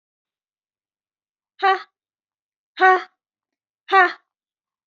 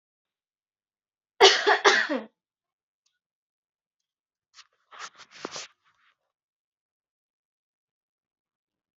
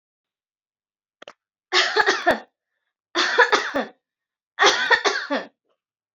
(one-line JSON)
{"exhalation_length": "4.9 s", "exhalation_amplitude": 26303, "exhalation_signal_mean_std_ratio": 0.25, "cough_length": "9.0 s", "cough_amplitude": 25328, "cough_signal_mean_std_ratio": 0.2, "three_cough_length": "6.1 s", "three_cough_amplitude": 27234, "three_cough_signal_mean_std_ratio": 0.42, "survey_phase": "alpha (2021-03-01 to 2021-08-12)", "age": "18-44", "gender": "Female", "wearing_mask": "No", "symptom_none": true, "smoker_status": "Never smoked", "respiratory_condition_asthma": false, "respiratory_condition_other": false, "recruitment_source": "REACT", "submission_delay": "2 days", "covid_test_result": "Negative", "covid_test_method": "RT-qPCR"}